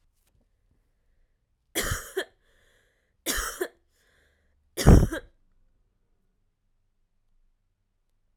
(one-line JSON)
{"three_cough_length": "8.4 s", "three_cough_amplitude": 27734, "three_cough_signal_mean_std_ratio": 0.2, "survey_phase": "alpha (2021-03-01 to 2021-08-12)", "age": "18-44", "gender": "Female", "wearing_mask": "No", "symptom_cough_any": true, "symptom_fatigue": true, "symptom_fever_high_temperature": true, "symptom_headache": true, "symptom_onset": "3 days", "smoker_status": "Ex-smoker", "respiratory_condition_asthma": false, "respiratory_condition_other": false, "recruitment_source": "Test and Trace", "submission_delay": "2 days", "covid_test_result": "Positive", "covid_test_method": "RT-qPCR", "covid_ct_value": 28.0, "covid_ct_gene": "ORF1ab gene"}